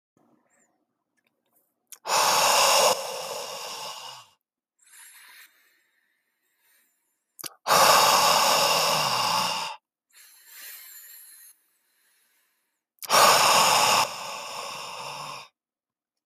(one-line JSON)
{"exhalation_length": "16.3 s", "exhalation_amplitude": 19676, "exhalation_signal_mean_std_ratio": 0.46, "survey_phase": "beta (2021-08-13 to 2022-03-07)", "age": "18-44", "gender": "Male", "wearing_mask": "No", "symptom_none": true, "smoker_status": "Never smoked", "respiratory_condition_asthma": false, "respiratory_condition_other": false, "recruitment_source": "REACT", "submission_delay": "1 day", "covid_test_result": "Negative", "covid_test_method": "RT-qPCR"}